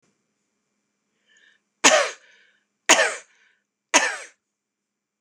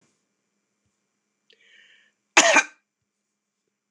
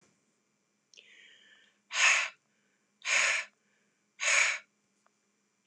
{"three_cough_length": "5.2 s", "three_cough_amplitude": 26028, "three_cough_signal_mean_std_ratio": 0.27, "cough_length": "3.9 s", "cough_amplitude": 25977, "cough_signal_mean_std_ratio": 0.2, "exhalation_length": "5.7 s", "exhalation_amplitude": 8671, "exhalation_signal_mean_std_ratio": 0.35, "survey_phase": "beta (2021-08-13 to 2022-03-07)", "age": "45-64", "gender": "Female", "wearing_mask": "No", "symptom_none": true, "smoker_status": "Ex-smoker", "respiratory_condition_asthma": false, "respiratory_condition_other": false, "recruitment_source": "REACT", "submission_delay": "1 day", "covid_test_result": "Negative", "covid_test_method": "RT-qPCR"}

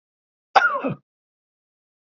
{"cough_length": "2.0 s", "cough_amplitude": 27465, "cough_signal_mean_std_ratio": 0.28, "survey_phase": "beta (2021-08-13 to 2022-03-07)", "age": "45-64", "gender": "Male", "wearing_mask": "No", "symptom_none": true, "smoker_status": "Ex-smoker", "respiratory_condition_asthma": false, "respiratory_condition_other": false, "recruitment_source": "REACT", "submission_delay": "2 days", "covid_test_result": "Negative", "covid_test_method": "RT-qPCR", "influenza_a_test_result": "Negative", "influenza_b_test_result": "Negative"}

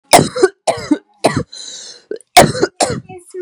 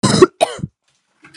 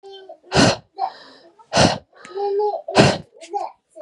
{"three_cough_length": "3.4 s", "three_cough_amplitude": 32768, "three_cough_signal_mean_std_ratio": 0.44, "cough_length": "1.4 s", "cough_amplitude": 32768, "cough_signal_mean_std_ratio": 0.37, "exhalation_length": "4.0 s", "exhalation_amplitude": 32767, "exhalation_signal_mean_std_ratio": 0.48, "survey_phase": "beta (2021-08-13 to 2022-03-07)", "age": "18-44", "gender": "Female", "wearing_mask": "No", "symptom_cough_any": true, "symptom_new_continuous_cough": true, "symptom_runny_or_blocked_nose": true, "symptom_shortness_of_breath": true, "symptom_abdominal_pain": true, "symptom_fatigue": true, "symptom_headache": true, "symptom_change_to_sense_of_smell_or_taste": true, "symptom_loss_of_taste": true, "symptom_onset": "3 days", "smoker_status": "Current smoker (1 to 10 cigarettes per day)", "respiratory_condition_asthma": true, "respiratory_condition_other": false, "recruitment_source": "Test and Trace", "submission_delay": "1 day", "covid_test_result": "Positive", "covid_test_method": "RT-qPCR", "covid_ct_value": 17.7, "covid_ct_gene": "ORF1ab gene"}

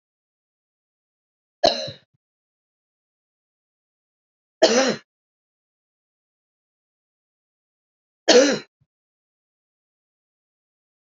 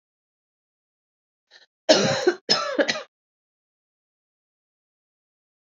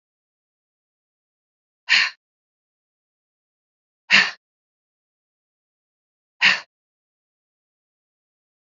{"three_cough_length": "11.1 s", "three_cough_amplitude": 31969, "three_cough_signal_mean_std_ratio": 0.2, "cough_length": "5.6 s", "cough_amplitude": 27457, "cough_signal_mean_std_ratio": 0.28, "exhalation_length": "8.6 s", "exhalation_amplitude": 26278, "exhalation_signal_mean_std_ratio": 0.19, "survey_phase": "beta (2021-08-13 to 2022-03-07)", "age": "45-64", "gender": "Female", "wearing_mask": "No", "symptom_cough_any": true, "symptom_runny_or_blocked_nose": true, "symptom_shortness_of_breath": true, "symptom_sore_throat": true, "symptom_headache": true, "symptom_onset": "3 days", "smoker_status": "Never smoked", "respiratory_condition_asthma": false, "respiratory_condition_other": false, "recruitment_source": "Test and Trace", "submission_delay": "2 days", "covid_test_result": "Positive", "covid_test_method": "RT-qPCR", "covid_ct_value": 22.1, "covid_ct_gene": "ORF1ab gene", "covid_ct_mean": 22.6, "covid_viral_load": "37000 copies/ml", "covid_viral_load_category": "Low viral load (10K-1M copies/ml)"}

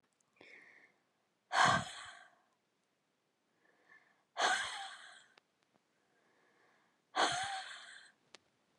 {"exhalation_length": "8.8 s", "exhalation_amplitude": 4816, "exhalation_signal_mean_std_ratio": 0.31, "survey_phase": "beta (2021-08-13 to 2022-03-07)", "age": "45-64", "gender": "Female", "wearing_mask": "No", "symptom_runny_or_blocked_nose": true, "smoker_status": "Never smoked", "respiratory_condition_asthma": false, "respiratory_condition_other": false, "recruitment_source": "REACT", "submission_delay": "2 days", "covid_test_result": "Negative", "covid_test_method": "RT-qPCR"}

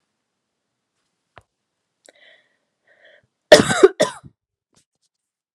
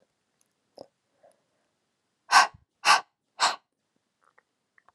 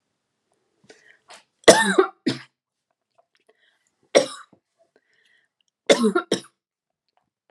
{"cough_length": "5.5 s", "cough_amplitude": 32768, "cough_signal_mean_std_ratio": 0.18, "exhalation_length": "4.9 s", "exhalation_amplitude": 20259, "exhalation_signal_mean_std_ratio": 0.22, "three_cough_length": "7.5 s", "three_cough_amplitude": 32768, "three_cough_signal_mean_std_ratio": 0.24, "survey_phase": "beta (2021-08-13 to 2022-03-07)", "age": "18-44", "gender": "Female", "wearing_mask": "No", "symptom_none": true, "smoker_status": "Never smoked", "respiratory_condition_asthma": false, "respiratory_condition_other": false, "recruitment_source": "REACT", "submission_delay": "1 day", "covid_test_result": "Negative", "covid_test_method": "RT-qPCR"}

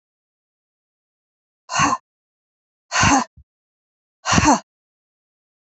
{"exhalation_length": "5.6 s", "exhalation_amplitude": 27433, "exhalation_signal_mean_std_ratio": 0.31, "survey_phase": "beta (2021-08-13 to 2022-03-07)", "age": "45-64", "gender": "Female", "wearing_mask": "No", "symptom_cough_any": true, "symptom_runny_or_blocked_nose": true, "symptom_shortness_of_breath": true, "symptom_sore_throat": true, "symptom_fatigue": true, "symptom_headache": true, "symptom_change_to_sense_of_smell_or_taste": true, "smoker_status": "Ex-smoker", "respiratory_condition_asthma": false, "respiratory_condition_other": false, "recruitment_source": "Test and Trace", "submission_delay": "2 days", "covid_test_result": "Positive", "covid_test_method": "LFT"}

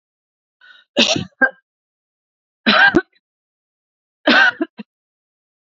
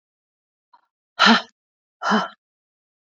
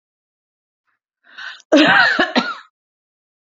{"three_cough_length": "5.6 s", "three_cough_amplitude": 32768, "three_cough_signal_mean_std_ratio": 0.33, "exhalation_length": "3.1 s", "exhalation_amplitude": 27503, "exhalation_signal_mean_std_ratio": 0.29, "cough_length": "3.5 s", "cough_amplitude": 28449, "cough_signal_mean_std_ratio": 0.38, "survey_phase": "alpha (2021-03-01 to 2021-08-12)", "age": "65+", "gender": "Female", "wearing_mask": "No", "symptom_none": true, "smoker_status": "Ex-smoker", "respiratory_condition_asthma": false, "respiratory_condition_other": false, "recruitment_source": "REACT", "submission_delay": "1 day", "covid_test_result": "Negative", "covid_test_method": "RT-qPCR"}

